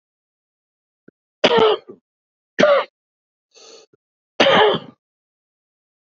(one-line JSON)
{"three_cough_length": "6.1 s", "three_cough_amplitude": 28917, "three_cough_signal_mean_std_ratio": 0.33, "survey_phase": "beta (2021-08-13 to 2022-03-07)", "age": "45-64", "gender": "Male", "wearing_mask": "No", "symptom_cough_any": true, "symptom_headache": true, "smoker_status": "Ex-smoker", "respiratory_condition_asthma": false, "respiratory_condition_other": false, "recruitment_source": "REACT", "submission_delay": "3 days", "covid_test_result": "Negative", "covid_test_method": "RT-qPCR", "influenza_a_test_result": "Negative", "influenza_b_test_result": "Negative"}